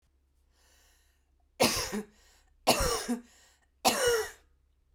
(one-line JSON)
{"three_cough_length": "4.9 s", "three_cough_amplitude": 10259, "three_cough_signal_mean_std_ratio": 0.41, "survey_phase": "beta (2021-08-13 to 2022-03-07)", "age": "18-44", "gender": "Female", "wearing_mask": "No", "symptom_cough_any": true, "symptom_fatigue": true, "symptom_headache": true, "symptom_change_to_sense_of_smell_or_taste": true, "smoker_status": "Never smoked", "respiratory_condition_asthma": false, "respiratory_condition_other": false, "recruitment_source": "Test and Trace", "submission_delay": "2 days", "covid_test_result": "Positive", "covid_test_method": "RT-qPCR"}